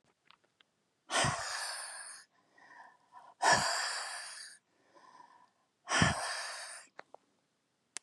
{
  "exhalation_length": "8.0 s",
  "exhalation_amplitude": 6662,
  "exhalation_signal_mean_std_ratio": 0.42,
  "survey_phase": "beta (2021-08-13 to 2022-03-07)",
  "age": "45-64",
  "gender": "Female",
  "wearing_mask": "No",
  "symptom_runny_or_blocked_nose": true,
  "symptom_shortness_of_breath": true,
  "symptom_change_to_sense_of_smell_or_taste": true,
  "smoker_status": "Ex-smoker",
  "respiratory_condition_asthma": false,
  "respiratory_condition_other": false,
  "recruitment_source": "REACT",
  "submission_delay": "2 days",
  "covid_test_result": "Negative",
  "covid_test_method": "RT-qPCR",
  "influenza_a_test_result": "Negative",
  "influenza_b_test_result": "Negative"
}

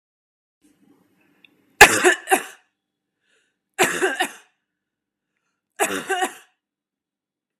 {
  "three_cough_length": "7.6 s",
  "three_cough_amplitude": 32768,
  "three_cough_signal_mean_std_ratio": 0.26,
  "survey_phase": "beta (2021-08-13 to 2022-03-07)",
  "age": "18-44",
  "gender": "Female",
  "wearing_mask": "No",
  "symptom_cough_any": true,
  "symptom_sore_throat": true,
  "symptom_fatigue": true,
  "symptom_onset": "10 days",
  "smoker_status": "Ex-smoker",
  "respiratory_condition_asthma": false,
  "respiratory_condition_other": false,
  "recruitment_source": "REACT",
  "submission_delay": "2 days",
  "covid_test_result": "Negative",
  "covid_test_method": "RT-qPCR",
  "influenza_a_test_result": "Negative",
  "influenza_b_test_result": "Negative"
}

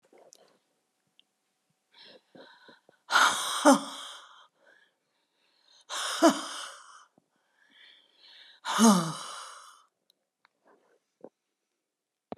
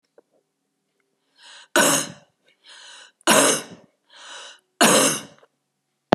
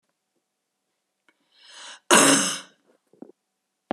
{
  "exhalation_length": "12.4 s",
  "exhalation_amplitude": 16142,
  "exhalation_signal_mean_std_ratio": 0.28,
  "three_cough_length": "6.1 s",
  "three_cough_amplitude": 32768,
  "three_cough_signal_mean_std_ratio": 0.34,
  "cough_length": "3.9 s",
  "cough_amplitude": 31841,
  "cough_signal_mean_std_ratio": 0.27,
  "survey_phase": "beta (2021-08-13 to 2022-03-07)",
  "age": "65+",
  "gender": "Female",
  "wearing_mask": "No",
  "symptom_none": true,
  "smoker_status": "Ex-smoker",
  "respiratory_condition_asthma": false,
  "respiratory_condition_other": true,
  "recruitment_source": "REACT",
  "submission_delay": "0 days",
  "covid_test_result": "Negative",
  "covid_test_method": "RT-qPCR"
}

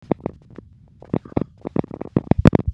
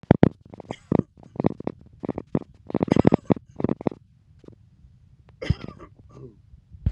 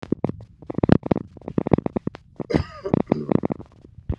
{
  "exhalation_length": "2.7 s",
  "exhalation_amplitude": 32768,
  "exhalation_signal_mean_std_ratio": 0.25,
  "three_cough_length": "6.9 s",
  "three_cough_amplitude": 32768,
  "three_cough_signal_mean_std_ratio": 0.23,
  "cough_length": "4.2 s",
  "cough_amplitude": 32768,
  "cough_signal_mean_std_ratio": 0.31,
  "survey_phase": "beta (2021-08-13 to 2022-03-07)",
  "age": "45-64",
  "gender": "Male",
  "wearing_mask": "No",
  "symptom_sore_throat": true,
  "smoker_status": "Never smoked",
  "respiratory_condition_asthma": true,
  "respiratory_condition_other": false,
  "recruitment_source": "REACT",
  "submission_delay": "2 days",
  "covid_test_result": "Negative",
  "covid_test_method": "RT-qPCR"
}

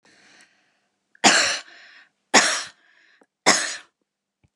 {
  "three_cough_length": "4.6 s",
  "three_cough_amplitude": 28977,
  "three_cough_signal_mean_std_ratio": 0.33,
  "survey_phase": "beta (2021-08-13 to 2022-03-07)",
  "age": "65+",
  "gender": "Female",
  "wearing_mask": "No",
  "symptom_none": true,
  "smoker_status": "Never smoked",
  "respiratory_condition_asthma": false,
  "respiratory_condition_other": false,
  "recruitment_source": "REACT",
  "submission_delay": "1 day",
  "covid_test_result": "Negative",
  "covid_test_method": "RT-qPCR",
  "influenza_a_test_result": "Negative",
  "influenza_b_test_result": "Negative"
}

